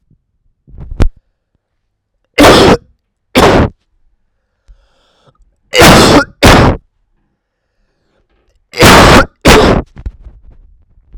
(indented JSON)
{
  "three_cough_length": "11.2 s",
  "three_cough_amplitude": 32768,
  "three_cough_signal_mean_std_ratio": 0.45,
  "survey_phase": "alpha (2021-03-01 to 2021-08-12)",
  "age": "18-44",
  "gender": "Male",
  "wearing_mask": "No",
  "symptom_cough_any": true,
  "symptom_fatigue": true,
  "symptom_headache": true,
  "smoker_status": "Ex-smoker",
  "respiratory_condition_asthma": false,
  "respiratory_condition_other": false,
  "recruitment_source": "Test and Trace",
  "submission_delay": "3 days",
  "covid_test_result": "Positive",
  "covid_test_method": "LFT"
}